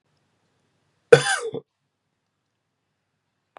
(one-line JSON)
{"cough_length": "3.6 s", "cough_amplitude": 32768, "cough_signal_mean_std_ratio": 0.17, "survey_phase": "beta (2021-08-13 to 2022-03-07)", "age": "45-64", "gender": "Male", "wearing_mask": "No", "symptom_cough_any": true, "symptom_runny_or_blocked_nose": true, "symptom_sore_throat": true, "smoker_status": "Ex-smoker", "respiratory_condition_asthma": false, "respiratory_condition_other": false, "recruitment_source": "Test and Trace", "submission_delay": "1 day", "covid_test_result": "Positive", "covid_test_method": "RT-qPCR", "covid_ct_value": 18.6, "covid_ct_gene": "N gene"}